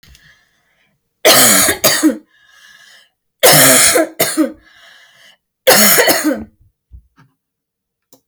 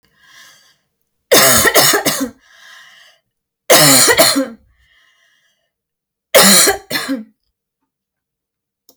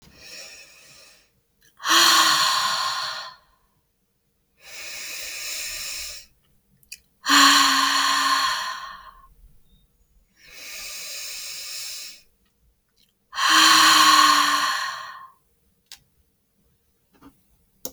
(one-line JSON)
{"cough_length": "8.3 s", "cough_amplitude": 32768, "cough_signal_mean_std_ratio": 0.47, "three_cough_length": "9.0 s", "three_cough_amplitude": 32768, "three_cough_signal_mean_std_ratio": 0.42, "exhalation_length": "17.9 s", "exhalation_amplitude": 24354, "exhalation_signal_mean_std_ratio": 0.45, "survey_phase": "alpha (2021-03-01 to 2021-08-12)", "age": "45-64", "gender": "Female", "wearing_mask": "No", "symptom_change_to_sense_of_smell_or_taste": true, "symptom_loss_of_taste": true, "symptom_onset": "12 days", "smoker_status": "Never smoked", "respiratory_condition_asthma": false, "respiratory_condition_other": false, "recruitment_source": "REACT", "submission_delay": "4 days", "covid_test_result": "Negative", "covid_test_method": "RT-qPCR", "covid_ct_value": 37.0, "covid_ct_gene": "N gene"}